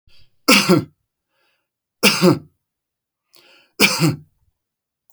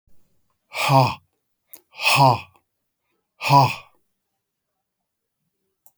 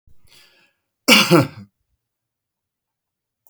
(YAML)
three_cough_length: 5.1 s
three_cough_amplitude: 32768
three_cough_signal_mean_std_ratio: 0.34
exhalation_length: 6.0 s
exhalation_amplitude: 27922
exhalation_signal_mean_std_ratio: 0.32
cough_length: 3.5 s
cough_amplitude: 32767
cough_signal_mean_std_ratio: 0.26
survey_phase: beta (2021-08-13 to 2022-03-07)
age: 65+
gender: Male
wearing_mask: 'No'
symptom_none: true
smoker_status: Never smoked
respiratory_condition_asthma: false
respiratory_condition_other: false
recruitment_source: REACT
submission_delay: 1 day
covid_test_result: Negative
covid_test_method: RT-qPCR